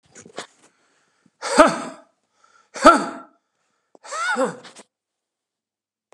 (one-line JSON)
{"exhalation_length": "6.1 s", "exhalation_amplitude": 32768, "exhalation_signal_mean_std_ratio": 0.27, "survey_phase": "beta (2021-08-13 to 2022-03-07)", "age": "65+", "gender": "Male", "wearing_mask": "No", "symptom_cough_any": true, "symptom_runny_or_blocked_nose": true, "smoker_status": "Ex-smoker", "respiratory_condition_asthma": false, "respiratory_condition_other": false, "recruitment_source": "REACT", "submission_delay": "2 days", "covid_test_result": "Negative", "covid_test_method": "RT-qPCR", "influenza_a_test_result": "Negative", "influenza_b_test_result": "Negative"}